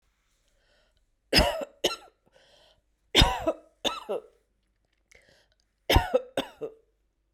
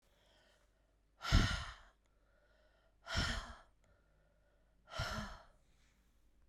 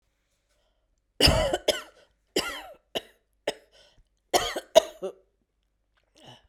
{
  "three_cough_length": "7.3 s",
  "three_cough_amplitude": 16441,
  "three_cough_signal_mean_std_ratio": 0.31,
  "exhalation_length": "6.5 s",
  "exhalation_amplitude": 4559,
  "exhalation_signal_mean_std_ratio": 0.32,
  "cough_length": "6.5 s",
  "cough_amplitude": 27032,
  "cough_signal_mean_std_ratio": 0.28,
  "survey_phase": "beta (2021-08-13 to 2022-03-07)",
  "age": "45-64",
  "gender": "Female",
  "wearing_mask": "No",
  "symptom_runny_or_blocked_nose": true,
  "symptom_shortness_of_breath": true,
  "symptom_sore_throat": true,
  "symptom_diarrhoea": true,
  "symptom_fatigue": true,
  "symptom_headache": true,
  "symptom_change_to_sense_of_smell_or_taste": true,
  "symptom_loss_of_taste": true,
  "symptom_onset": "2 days",
  "smoker_status": "Never smoked",
  "respiratory_condition_asthma": false,
  "respiratory_condition_other": false,
  "recruitment_source": "Test and Trace",
  "submission_delay": "1 day",
  "covid_test_result": "Positive",
  "covid_test_method": "ePCR"
}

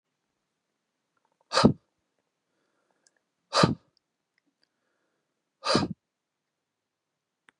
{
  "exhalation_length": "7.6 s",
  "exhalation_amplitude": 20170,
  "exhalation_signal_mean_std_ratio": 0.2,
  "survey_phase": "beta (2021-08-13 to 2022-03-07)",
  "age": "45-64",
  "gender": "Male",
  "wearing_mask": "No",
  "symptom_cough_any": true,
  "symptom_fatigue": true,
  "symptom_headache": true,
  "symptom_onset": "6 days",
  "smoker_status": "Ex-smoker",
  "respiratory_condition_asthma": false,
  "respiratory_condition_other": false,
  "recruitment_source": "Test and Trace",
  "submission_delay": "2 days",
  "covid_test_result": "Positive",
  "covid_test_method": "RT-qPCR"
}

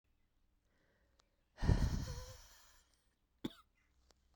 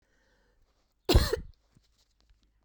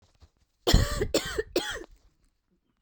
{
  "exhalation_length": "4.4 s",
  "exhalation_amplitude": 4164,
  "exhalation_signal_mean_std_ratio": 0.29,
  "cough_length": "2.6 s",
  "cough_amplitude": 15484,
  "cough_signal_mean_std_ratio": 0.24,
  "three_cough_length": "2.8 s",
  "three_cough_amplitude": 20449,
  "three_cough_signal_mean_std_ratio": 0.39,
  "survey_phase": "beta (2021-08-13 to 2022-03-07)",
  "age": "45-64",
  "gender": "Female",
  "wearing_mask": "Yes",
  "symptom_cough_any": true,
  "symptom_runny_or_blocked_nose": true,
  "symptom_shortness_of_breath": true,
  "symptom_fatigue": true,
  "symptom_fever_high_temperature": true,
  "symptom_headache": true,
  "symptom_change_to_sense_of_smell_or_taste": true,
  "symptom_loss_of_taste": true,
  "symptom_other": true,
  "symptom_onset": "5 days",
  "smoker_status": "Ex-smoker",
  "respiratory_condition_asthma": true,
  "respiratory_condition_other": false,
  "recruitment_source": "Test and Trace",
  "submission_delay": "0 days",
  "covid_test_result": "Positive",
  "covid_test_method": "RT-qPCR",
  "covid_ct_value": 24.0,
  "covid_ct_gene": "ORF1ab gene"
}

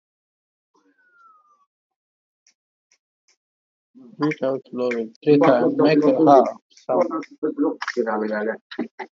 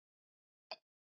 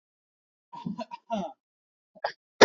{
  "exhalation_length": "9.1 s",
  "exhalation_amplitude": 26275,
  "exhalation_signal_mean_std_ratio": 0.46,
  "three_cough_length": "1.2 s",
  "three_cough_amplitude": 972,
  "three_cough_signal_mean_std_ratio": 0.13,
  "cough_length": "2.6 s",
  "cough_amplitude": 27036,
  "cough_signal_mean_std_ratio": 0.19,
  "survey_phase": "beta (2021-08-13 to 2022-03-07)",
  "age": "18-44",
  "gender": "Male",
  "wearing_mask": "No",
  "symptom_fever_high_temperature": true,
  "symptom_headache": true,
  "symptom_onset": "4 days",
  "smoker_status": "Ex-smoker",
  "respiratory_condition_asthma": false,
  "respiratory_condition_other": false,
  "recruitment_source": "Test and Trace",
  "submission_delay": "2 days",
  "covid_test_result": "Positive",
  "covid_test_method": "RT-qPCR",
  "covid_ct_value": 28.5,
  "covid_ct_gene": "ORF1ab gene",
  "covid_ct_mean": 28.6,
  "covid_viral_load": "420 copies/ml",
  "covid_viral_load_category": "Minimal viral load (< 10K copies/ml)"
}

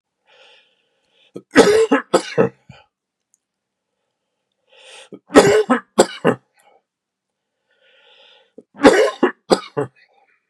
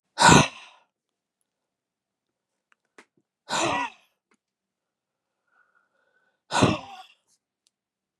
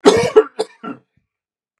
{
  "three_cough_length": "10.5 s",
  "three_cough_amplitude": 32768,
  "three_cough_signal_mean_std_ratio": 0.31,
  "exhalation_length": "8.2 s",
  "exhalation_amplitude": 28447,
  "exhalation_signal_mean_std_ratio": 0.23,
  "cough_length": "1.8 s",
  "cough_amplitude": 32768,
  "cough_signal_mean_std_ratio": 0.36,
  "survey_phase": "beta (2021-08-13 to 2022-03-07)",
  "age": "45-64",
  "gender": "Male",
  "wearing_mask": "No",
  "symptom_fatigue": true,
  "symptom_headache": true,
  "symptom_onset": "10 days",
  "smoker_status": "Never smoked",
  "respiratory_condition_asthma": false,
  "respiratory_condition_other": false,
  "recruitment_source": "REACT",
  "submission_delay": "2 days",
  "covid_test_result": "Negative",
  "covid_test_method": "RT-qPCR"
}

